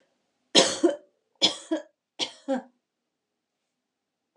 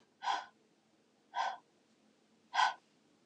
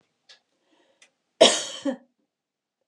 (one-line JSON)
{"three_cough_length": "4.4 s", "three_cough_amplitude": 27558, "three_cough_signal_mean_std_ratio": 0.29, "exhalation_length": "3.3 s", "exhalation_amplitude": 4514, "exhalation_signal_mean_std_ratio": 0.34, "cough_length": "2.9 s", "cough_amplitude": 27046, "cough_signal_mean_std_ratio": 0.23, "survey_phase": "beta (2021-08-13 to 2022-03-07)", "age": "45-64", "gender": "Female", "wearing_mask": "No", "symptom_none": true, "smoker_status": "Never smoked", "respiratory_condition_asthma": false, "respiratory_condition_other": false, "recruitment_source": "REACT", "submission_delay": "2 days", "covid_test_result": "Negative", "covid_test_method": "RT-qPCR", "influenza_a_test_result": "Negative", "influenza_b_test_result": "Negative"}